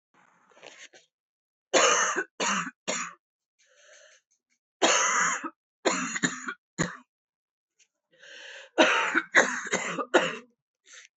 {"three_cough_length": "11.2 s", "three_cough_amplitude": 18365, "three_cough_signal_mean_std_ratio": 0.43, "survey_phase": "beta (2021-08-13 to 2022-03-07)", "age": "18-44", "gender": "Female", "wearing_mask": "No", "symptom_cough_any": true, "symptom_new_continuous_cough": true, "symptom_runny_or_blocked_nose": true, "symptom_sore_throat": true, "symptom_abdominal_pain": true, "symptom_diarrhoea": true, "symptom_fatigue": true, "symptom_headache": true, "symptom_change_to_sense_of_smell_or_taste": true, "symptom_loss_of_taste": true, "symptom_onset": "2 days", "smoker_status": "Current smoker (11 or more cigarettes per day)", "respiratory_condition_asthma": false, "respiratory_condition_other": false, "recruitment_source": "Test and Trace", "submission_delay": "1 day", "covid_test_result": "Positive", "covid_test_method": "RT-qPCR", "covid_ct_value": 20.6, "covid_ct_gene": "ORF1ab gene", "covid_ct_mean": 21.2, "covid_viral_load": "110000 copies/ml", "covid_viral_load_category": "Low viral load (10K-1M copies/ml)"}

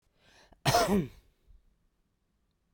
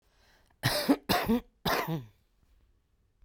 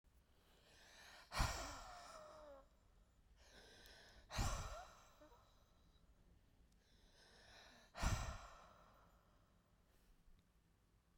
{"cough_length": "2.7 s", "cough_amplitude": 8094, "cough_signal_mean_std_ratio": 0.32, "three_cough_length": "3.2 s", "three_cough_amplitude": 9114, "three_cough_signal_mean_std_ratio": 0.44, "exhalation_length": "11.2 s", "exhalation_amplitude": 1746, "exhalation_signal_mean_std_ratio": 0.38, "survey_phase": "beta (2021-08-13 to 2022-03-07)", "age": "45-64", "gender": "Female", "wearing_mask": "No", "symptom_none": true, "smoker_status": "Current smoker (e-cigarettes or vapes only)", "respiratory_condition_asthma": false, "respiratory_condition_other": false, "recruitment_source": "REACT", "submission_delay": "1 day", "covid_test_result": "Negative", "covid_test_method": "RT-qPCR", "influenza_a_test_result": "Negative", "influenza_b_test_result": "Negative"}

